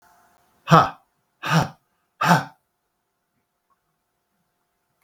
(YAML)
exhalation_length: 5.0 s
exhalation_amplitude: 32768
exhalation_signal_mean_std_ratio: 0.26
survey_phase: beta (2021-08-13 to 2022-03-07)
age: 65+
gender: Male
wearing_mask: 'No'
symptom_none: true
smoker_status: Ex-smoker
respiratory_condition_asthma: false
respiratory_condition_other: false
recruitment_source: REACT
submission_delay: 3 days
covid_test_result: Negative
covid_test_method: RT-qPCR